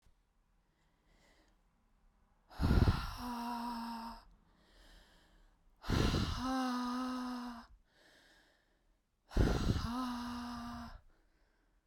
{"exhalation_length": "11.9 s", "exhalation_amplitude": 5197, "exhalation_signal_mean_std_ratio": 0.48, "survey_phase": "beta (2021-08-13 to 2022-03-07)", "age": "18-44", "gender": "Female", "wearing_mask": "No", "symptom_none": true, "smoker_status": "Never smoked", "respiratory_condition_asthma": false, "respiratory_condition_other": false, "recruitment_source": "REACT", "submission_delay": "0 days", "covid_test_result": "Negative", "covid_test_method": "RT-qPCR", "influenza_a_test_result": "Negative", "influenza_b_test_result": "Negative"}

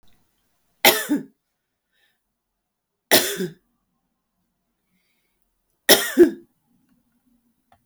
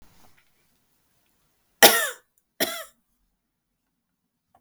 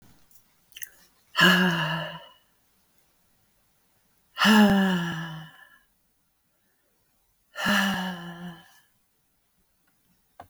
{"three_cough_length": "7.9 s", "three_cough_amplitude": 32768, "three_cough_signal_mean_std_ratio": 0.24, "cough_length": "4.6 s", "cough_amplitude": 32768, "cough_signal_mean_std_ratio": 0.19, "exhalation_length": "10.5 s", "exhalation_amplitude": 16961, "exhalation_signal_mean_std_ratio": 0.37, "survey_phase": "beta (2021-08-13 to 2022-03-07)", "age": "45-64", "gender": "Female", "wearing_mask": "No", "symptom_cough_any": true, "symptom_sore_throat": true, "symptom_diarrhoea": true, "symptom_fatigue": true, "symptom_fever_high_temperature": true, "symptom_onset": "3 days", "smoker_status": "Never smoked", "respiratory_condition_asthma": false, "respiratory_condition_other": false, "recruitment_source": "Test and Trace", "submission_delay": "2 days", "covid_test_result": "Positive", "covid_test_method": "RT-qPCR", "covid_ct_value": 15.6, "covid_ct_gene": "ORF1ab gene", "covid_ct_mean": 16.2, "covid_viral_load": "4900000 copies/ml", "covid_viral_load_category": "High viral load (>1M copies/ml)"}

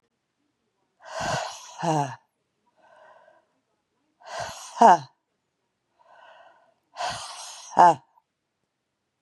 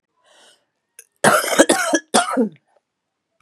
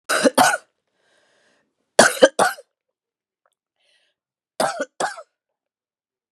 {"exhalation_length": "9.2 s", "exhalation_amplitude": 23848, "exhalation_signal_mean_std_ratio": 0.25, "cough_length": "3.4 s", "cough_amplitude": 32768, "cough_signal_mean_std_ratio": 0.41, "three_cough_length": "6.3 s", "three_cough_amplitude": 32768, "three_cough_signal_mean_std_ratio": 0.28, "survey_phase": "beta (2021-08-13 to 2022-03-07)", "age": "45-64", "gender": "Female", "wearing_mask": "No", "symptom_cough_any": true, "symptom_runny_or_blocked_nose": true, "symptom_sore_throat": true, "symptom_diarrhoea": true, "symptom_fatigue": true, "symptom_fever_high_temperature": true, "symptom_change_to_sense_of_smell_or_taste": true, "symptom_loss_of_taste": true, "symptom_onset": "3 days", "smoker_status": "Current smoker (1 to 10 cigarettes per day)", "respiratory_condition_asthma": false, "respiratory_condition_other": false, "recruitment_source": "Test and Trace", "submission_delay": "1 day", "covid_test_result": "Positive", "covid_test_method": "RT-qPCR", "covid_ct_value": 17.9, "covid_ct_gene": "N gene"}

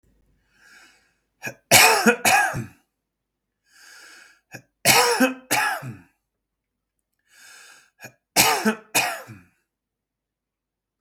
{"three_cough_length": "11.0 s", "three_cough_amplitude": 32768, "three_cough_signal_mean_std_ratio": 0.35, "survey_phase": "beta (2021-08-13 to 2022-03-07)", "age": "45-64", "gender": "Male", "wearing_mask": "No", "symptom_none": true, "smoker_status": "Never smoked", "respiratory_condition_asthma": false, "respiratory_condition_other": false, "recruitment_source": "REACT", "submission_delay": "1 day", "covid_test_result": "Negative", "covid_test_method": "RT-qPCR", "influenza_a_test_result": "Negative", "influenza_b_test_result": "Negative"}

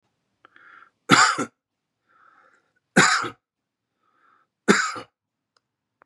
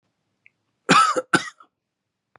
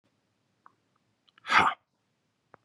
{"three_cough_length": "6.1 s", "three_cough_amplitude": 29282, "three_cough_signal_mean_std_ratio": 0.28, "cough_length": "2.4 s", "cough_amplitude": 26875, "cough_signal_mean_std_ratio": 0.32, "exhalation_length": "2.6 s", "exhalation_amplitude": 14806, "exhalation_signal_mean_std_ratio": 0.23, "survey_phase": "beta (2021-08-13 to 2022-03-07)", "age": "45-64", "gender": "Male", "wearing_mask": "No", "symptom_runny_or_blocked_nose": true, "smoker_status": "Current smoker (1 to 10 cigarettes per day)", "respiratory_condition_asthma": false, "respiratory_condition_other": false, "recruitment_source": "Test and Trace", "submission_delay": "2 days", "covid_test_result": "Positive", "covid_test_method": "LFT"}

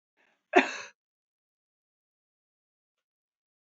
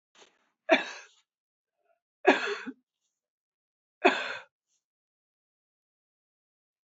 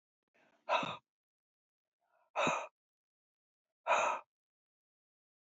{"cough_length": "3.7 s", "cough_amplitude": 16123, "cough_signal_mean_std_ratio": 0.14, "three_cough_length": "7.0 s", "three_cough_amplitude": 16356, "three_cough_signal_mean_std_ratio": 0.22, "exhalation_length": "5.5 s", "exhalation_amplitude": 3600, "exhalation_signal_mean_std_ratio": 0.31, "survey_phase": "beta (2021-08-13 to 2022-03-07)", "age": "65+", "gender": "Female", "wearing_mask": "No", "symptom_none": true, "smoker_status": "Never smoked", "respiratory_condition_asthma": false, "respiratory_condition_other": false, "recruitment_source": "Test and Trace", "submission_delay": "1 day", "covid_test_result": "Negative", "covid_test_method": "RT-qPCR"}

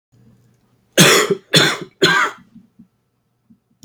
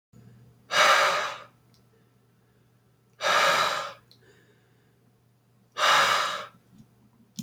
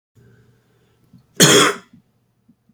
{"three_cough_length": "3.8 s", "three_cough_amplitude": 32768, "three_cough_signal_mean_std_ratio": 0.39, "exhalation_length": "7.4 s", "exhalation_amplitude": 12948, "exhalation_signal_mean_std_ratio": 0.42, "cough_length": "2.7 s", "cough_amplitude": 32767, "cough_signal_mean_std_ratio": 0.29, "survey_phase": "beta (2021-08-13 to 2022-03-07)", "age": "18-44", "gender": "Male", "wearing_mask": "No", "symptom_runny_or_blocked_nose": true, "symptom_sore_throat": true, "symptom_fever_high_temperature": true, "symptom_headache": true, "symptom_onset": "5 days", "smoker_status": "Never smoked", "respiratory_condition_asthma": false, "respiratory_condition_other": false, "recruitment_source": "Test and Trace", "submission_delay": "1 day", "covid_test_result": "Positive", "covid_test_method": "RT-qPCR", "covid_ct_value": 18.8, "covid_ct_gene": "ORF1ab gene"}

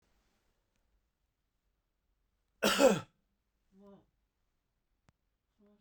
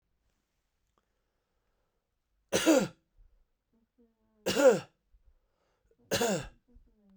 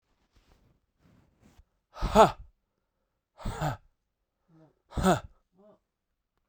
{"cough_length": "5.8 s", "cough_amplitude": 8018, "cough_signal_mean_std_ratio": 0.19, "three_cough_length": "7.2 s", "three_cough_amplitude": 10238, "three_cough_signal_mean_std_ratio": 0.27, "exhalation_length": "6.5 s", "exhalation_amplitude": 20256, "exhalation_signal_mean_std_ratio": 0.24, "survey_phase": "beta (2021-08-13 to 2022-03-07)", "age": "45-64", "gender": "Male", "wearing_mask": "No", "symptom_none": true, "smoker_status": "Ex-smoker", "respiratory_condition_asthma": false, "respiratory_condition_other": false, "recruitment_source": "REACT", "submission_delay": "1 day", "covid_test_result": "Negative", "covid_test_method": "RT-qPCR"}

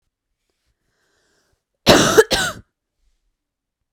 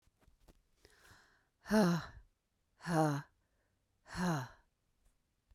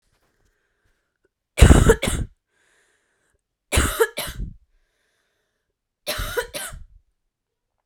{"cough_length": "3.9 s", "cough_amplitude": 32768, "cough_signal_mean_std_ratio": 0.27, "exhalation_length": "5.5 s", "exhalation_amplitude": 3456, "exhalation_signal_mean_std_ratio": 0.35, "three_cough_length": "7.9 s", "three_cough_amplitude": 32768, "three_cough_signal_mean_std_ratio": 0.27, "survey_phase": "beta (2021-08-13 to 2022-03-07)", "age": "18-44", "gender": "Female", "wearing_mask": "No", "symptom_cough_any": true, "symptom_runny_or_blocked_nose": true, "symptom_headache": true, "smoker_status": "Never smoked", "respiratory_condition_asthma": true, "respiratory_condition_other": false, "recruitment_source": "Test and Trace", "submission_delay": "1 day", "covid_test_result": "Positive", "covid_test_method": "RT-qPCR", "covid_ct_value": 20.5, "covid_ct_gene": "ORF1ab gene", "covid_ct_mean": 20.7, "covid_viral_load": "160000 copies/ml", "covid_viral_load_category": "Low viral load (10K-1M copies/ml)"}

